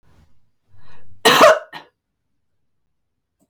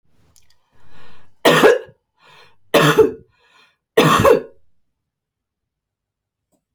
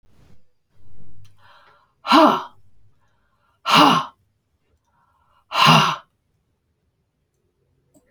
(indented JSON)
{
  "cough_length": "3.5 s",
  "cough_amplitude": 30290,
  "cough_signal_mean_std_ratio": 0.3,
  "three_cough_length": "6.7 s",
  "three_cough_amplitude": 32768,
  "three_cough_signal_mean_std_ratio": 0.36,
  "exhalation_length": "8.1 s",
  "exhalation_amplitude": 30590,
  "exhalation_signal_mean_std_ratio": 0.33,
  "survey_phase": "beta (2021-08-13 to 2022-03-07)",
  "age": "65+",
  "gender": "Female",
  "wearing_mask": "No",
  "symptom_none": true,
  "smoker_status": "Never smoked",
  "respiratory_condition_asthma": false,
  "respiratory_condition_other": false,
  "recruitment_source": "REACT",
  "submission_delay": "1 day",
  "covid_test_result": "Negative",
  "covid_test_method": "RT-qPCR"
}